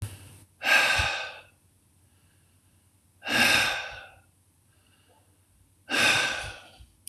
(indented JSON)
{
  "exhalation_length": "7.1 s",
  "exhalation_amplitude": 13374,
  "exhalation_signal_mean_std_ratio": 0.43,
  "survey_phase": "beta (2021-08-13 to 2022-03-07)",
  "age": "45-64",
  "gender": "Male",
  "wearing_mask": "No",
  "symptom_none": true,
  "smoker_status": "Never smoked",
  "respiratory_condition_asthma": false,
  "respiratory_condition_other": false,
  "recruitment_source": "REACT",
  "submission_delay": "3 days",
  "covid_test_result": "Negative",
  "covid_test_method": "RT-qPCR",
  "influenza_a_test_result": "Negative",
  "influenza_b_test_result": "Negative"
}